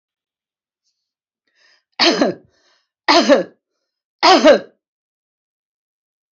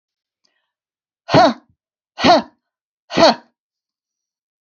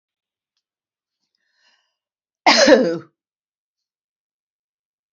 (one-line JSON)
{"three_cough_length": "6.3 s", "three_cough_amplitude": 31197, "three_cough_signal_mean_std_ratio": 0.31, "exhalation_length": "4.8 s", "exhalation_amplitude": 27871, "exhalation_signal_mean_std_ratio": 0.29, "cough_length": "5.1 s", "cough_amplitude": 31016, "cough_signal_mean_std_ratio": 0.24, "survey_phase": "alpha (2021-03-01 to 2021-08-12)", "age": "65+", "gender": "Female", "wearing_mask": "No", "symptom_none": true, "smoker_status": "Ex-smoker", "respiratory_condition_asthma": false, "respiratory_condition_other": false, "recruitment_source": "REACT", "submission_delay": "2 days", "covid_test_result": "Negative", "covid_test_method": "RT-qPCR"}